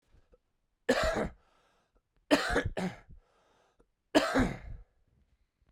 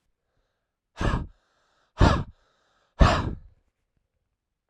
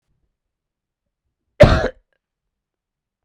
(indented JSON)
{
  "three_cough_length": "5.7 s",
  "three_cough_amplitude": 11782,
  "three_cough_signal_mean_std_ratio": 0.38,
  "exhalation_length": "4.7 s",
  "exhalation_amplitude": 24247,
  "exhalation_signal_mean_std_ratio": 0.29,
  "cough_length": "3.2 s",
  "cough_amplitude": 32768,
  "cough_signal_mean_std_ratio": 0.2,
  "survey_phase": "beta (2021-08-13 to 2022-03-07)",
  "age": "18-44",
  "gender": "Male",
  "wearing_mask": "No",
  "symptom_cough_any": true,
  "symptom_runny_or_blocked_nose": true,
  "symptom_sore_throat": true,
  "symptom_fatigue": true,
  "symptom_other": true,
  "symptom_onset": "3 days",
  "smoker_status": "Never smoked",
  "respiratory_condition_asthma": false,
  "respiratory_condition_other": false,
  "recruitment_source": "Test and Trace",
  "submission_delay": "2 days",
  "covid_test_result": "Positive",
  "covid_test_method": "RT-qPCR",
  "covid_ct_value": 21.3,
  "covid_ct_gene": "ORF1ab gene",
  "covid_ct_mean": 21.9,
  "covid_viral_load": "67000 copies/ml",
  "covid_viral_load_category": "Low viral load (10K-1M copies/ml)"
}